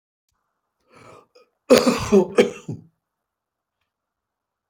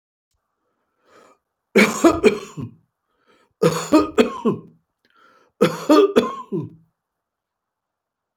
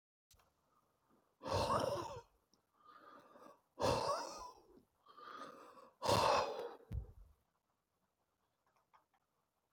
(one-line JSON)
{"cough_length": "4.7 s", "cough_amplitude": 29867, "cough_signal_mean_std_ratio": 0.28, "three_cough_length": "8.4 s", "three_cough_amplitude": 32292, "three_cough_signal_mean_std_ratio": 0.36, "exhalation_length": "9.7 s", "exhalation_amplitude": 3048, "exhalation_signal_mean_std_ratio": 0.39, "survey_phase": "beta (2021-08-13 to 2022-03-07)", "age": "65+", "gender": "Male", "wearing_mask": "No", "symptom_fatigue": true, "symptom_onset": "12 days", "smoker_status": "Current smoker (1 to 10 cigarettes per day)", "respiratory_condition_asthma": false, "respiratory_condition_other": false, "recruitment_source": "REACT", "submission_delay": "2 days", "covid_test_result": "Negative", "covid_test_method": "RT-qPCR", "influenza_a_test_result": "Negative", "influenza_b_test_result": "Negative"}